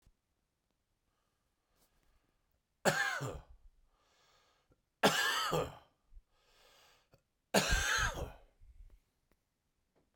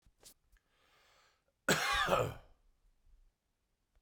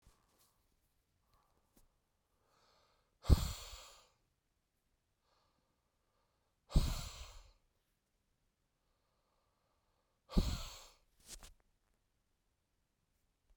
{"three_cough_length": "10.2 s", "three_cough_amplitude": 7697, "three_cough_signal_mean_std_ratio": 0.34, "cough_length": "4.0 s", "cough_amplitude": 5699, "cough_signal_mean_std_ratio": 0.33, "exhalation_length": "13.6 s", "exhalation_amplitude": 8557, "exhalation_signal_mean_std_ratio": 0.19, "survey_phase": "beta (2021-08-13 to 2022-03-07)", "age": "18-44", "gender": "Male", "wearing_mask": "No", "symptom_change_to_sense_of_smell_or_taste": true, "smoker_status": "Ex-smoker", "respiratory_condition_asthma": false, "respiratory_condition_other": false, "recruitment_source": "REACT", "submission_delay": "3 days", "covid_test_result": "Negative", "covid_test_method": "RT-qPCR"}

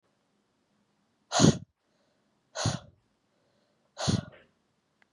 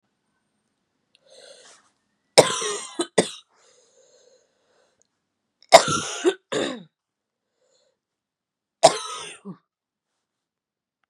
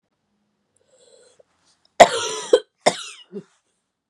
{"exhalation_length": "5.1 s", "exhalation_amplitude": 19445, "exhalation_signal_mean_std_ratio": 0.25, "three_cough_length": "11.1 s", "three_cough_amplitude": 32768, "three_cough_signal_mean_std_ratio": 0.21, "cough_length": "4.1 s", "cough_amplitude": 32768, "cough_signal_mean_std_ratio": 0.21, "survey_phase": "beta (2021-08-13 to 2022-03-07)", "age": "18-44", "gender": "Female", "wearing_mask": "No", "symptom_cough_any": true, "symptom_runny_or_blocked_nose": true, "symptom_sore_throat": true, "symptom_fatigue": true, "symptom_fever_high_temperature": true, "symptom_headache": true, "symptom_other": true, "symptom_onset": "3 days", "smoker_status": "Never smoked", "respiratory_condition_asthma": false, "respiratory_condition_other": false, "recruitment_source": "Test and Trace", "submission_delay": "2 days", "covid_test_result": "Positive", "covid_test_method": "RT-qPCR", "covid_ct_value": 32.4, "covid_ct_gene": "N gene"}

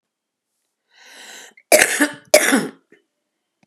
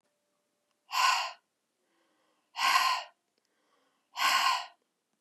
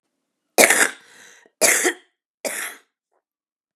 {"cough_length": "3.7 s", "cough_amplitude": 32768, "cough_signal_mean_std_ratio": 0.32, "exhalation_length": "5.2 s", "exhalation_amplitude": 9804, "exhalation_signal_mean_std_ratio": 0.41, "three_cough_length": "3.8 s", "three_cough_amplitude": 32768, "three_cough_signal_mean_std_ratio": 0.33, "survey_phase": "beta (2021-08-13 to 2022-03-07)", "age": "45-64", "gender": "Female", "wearing_mask": "No", "symptom_cough_any": true, "smoker_status": "Never smoked", "respiratory_condition_asthma": false, "respiratory_condition_other": false, "recruitment_source": "REACT", "submission_delay": "1 day", "covid_test_result": "Negative", "covid_test_method": "RT-qPCR", "influenza_a_test_result": "Negative", "influenza_b_test_result": "Negative"}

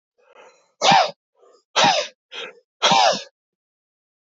{"exhalation_length": "4.3 s", "exhalation_amplitude": 25933, "exhalation_signal_mean_std_ratio": 0.39, "survey_phase": "beta (2021-08-13 to 2022-03-07)", "age": "65+", "gender": "Male", "wearing_mask": "No", "symptom_none": true, "smoker_status": "Ex-smoker", "respiratory_condition_asthma": false, "respiratory_condition_other": false, "recruitment_source": "REACT", "submission_delay": "-1 day", "covid_test_result": "Negative", "covid_test_method": "RT-qPCR", "influenza_a_test_result": "Negative", "influenza_b_test_result": "Negative"}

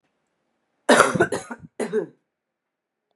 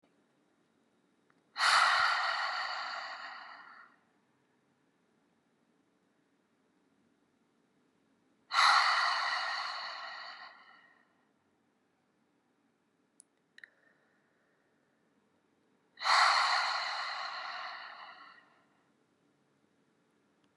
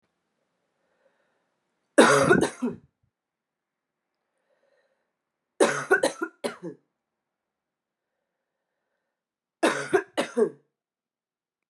{"cough_length": "3.2 s", "cough_amplitude": 32767, "cough_signal_mean_std_ratio": 0.33, "exhalation_length": "20.6 s", "exhalation_amplitude": 7181, "exhalation_signal_mean_std_ratio": 0.37, "three_cough_length": "11.7 s", "three_cough_amplitude": 25898, "three_cough_signal_mean_std_ratio": 0.27, "survey_phase": "beta (2021-08-13 to 2022-03-07)", "age": "18-44", "gender": "Female", "wearing_mask": "No", "symptom_cough_any": true, "symptom_runny_or_blocked_nose": true, "symptom_fatigue": true, "symptom_headache": true, "symptom_onset": "3 days", "smoker_status": "Ex-smoker", "respiratory_condition_asthma": false, "respiratory_condition_other": false, "recruitment_source": "Test and Trace", "submission_delay": "1 day", "covid_test_result": "Positive", "covid_test_method": "RT-qPCR", "covid_ct_value": 22.7, "covid_ct_gene": "N gene"}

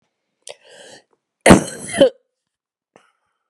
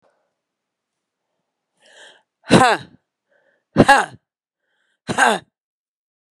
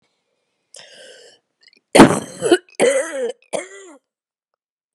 {"cough_length": "3.5 s", "cough_amplitude": 32768, "cough_signal_mean_std_ratio": 0.24, "exhalation_length": "6.4 s", "exhalation_amplitude": 32768, "exhalation_signal_mean_std_ratio": 0.26, "three_cough_length": "4.9 s", "three_cough_amplitude": 32768, "three_cough_signal_mean_std_ratio": 0.3, "survey_phase": "beta (2021-08-13 to 2022-03-07)", "age": "45-64", "gender": "Female", "wearing_mask": "No", "symptom_cough_any": true, "symptom_new_continuous_cough": true, "symptom_runny_or_blocked_nose": true, "symptom_sore_throat": true, "symptom_fatigue": true, "symptom_headache": true, "symptom_change_to_sense_of_smell_or_taste": true, "symptom_loss_of_taste": true, "symptom_onset": "4 days", "smoker_status": "Never smoked", "respiratory_condition_asthma": false, "respiratory_condition_other": false, "recruitment_source": "Test and Trace", "submission_delay": "2 days", "covid_test_result": "Positive", "covid_test_method": "RT-qPCR", "covid_ct_value": 17.7, "covid_ct_gene": "ORF1ab gene", "covid_ct_mean": 18.0, "covid_viral_load": "1200000 copies/ml", "covid_viral_load_category": "High viral load (>1M copies/ml)"}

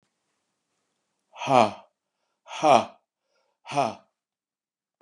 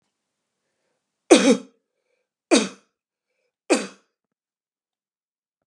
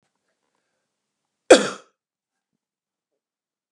{"exhalation_length": "5.0 s", "exhalation_amplitude": 23008, "exhalation_signal_mean_std_ratio": 0.26, "three_cough_length": "5.7 s", "three_cough_amplitude": 32595, "three_cough_signal_mean_std_ratio": 0.23, "cough_length": "3.7 s", "cough_amplitude": 32768, "cough_signal_mean_std_ratio": 0.14, "survey_phase": "beta (2021-08-13 to 2022-03-07)", "age": "65+", "gender": "Male", "wearing_mask": "No", "symptom_none": true, "smoker_status": "Never smoked", "respiratory_condition_asthma": false, "respiratory_condition_other": false, "recruitment_source": "REACT", "submission_delay": "2 days", "covid_test_result": "Negative", "covid_test_method": "RT-qPCR", "influenza_a_test_result": "Negative", "influenza_b_test_result": "Negative"}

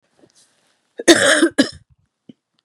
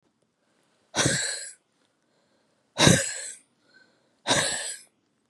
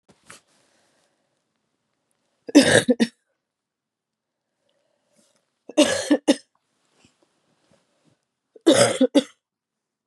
{"cough_length": "2.6 s", "cough_amplitude": 32768, "cough_signal_mean_std_ratio": 0.34, "exhalation_length": "5.3 s", "exhalation_amplitude": 25723, "exhalation_signal_mean_std_ratio": 0.36, "three_cough_length": "10.1 s", "three_cough_amplitude": 31690, "three_cough_signal_mean_std_ratio": 0.26, "survey_phase": "beta (2021-08-13 to 2022-03-07)", "age": "45-64", "gender": "Female", "wearing_mask": "No", "symptom_cough_any": true, "symptom_runny_or_blocked_nose": true, "symptom_shortness_of_breath": true, "symptom_sore_throat": true, "symptom_fatigue": true, "symptom_fever_high_temperature": true, "symptom_headache": true, "symptom_change_to_sense_of_smell_or_taste": true, "symptom_loss_of_taste": true, "symptom_onset": "5 days", "smoker_status": "Never smoked", "respiratory_condition_asthma": false, "respiratory_condition_other": false, "recruitment_source": "Test and Trace", "submission_delay": "1 day", "covid_test_result": "Positive", "covid_test_method": "RT-qPCR", "covid_ct_value": 18.8, "covid_ct_gene": "ORF1ab gene", "covid_ct_mean": 19.7, "covid_viral_load": "330000 copies/ml", "covid_viral_load_category": "Low viral load (10K-1M copies/ml)"}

